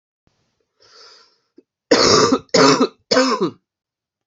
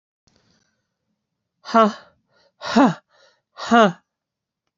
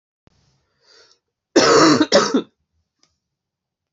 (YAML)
three_cough_length: 4.3 s
three_cough_amplitude: 30147
three_cough_signal_mean_std_ratio: 0.43
exhalation_length: 4.8 s
exhalation_amplitude: 28194
exhalation_signal_mean_std_ratio: 0.29
cough_length: 3.9 s
cough_amplitude: 27992
cough_signal_mean_std_ratio: 0.36
survey_phase: beta (2021-08-13 to 2022-03-07)
age: 45-64
gender: Female
wearing_mask: 'No'
symptom_new_continuous_cough: true
symptom_runny_or_blocked_nose: true
symptom_sore_throat: true
symptom_abdominal_pain: true
symptom_fever_high_temperature: true
symptom_headache: true
symptom_onset: 5 days
smoker_status: Never smoked
respiratory_condition_asthma: false
respiratory_condition_other: false
recruitment_source: Test and Trace
submission_delay: 2 days
covid_test_result: Positive
covid_test_method: RT-qPCR
covid_ct_value: 20.3
covid_ct_gene: ORF1ab gene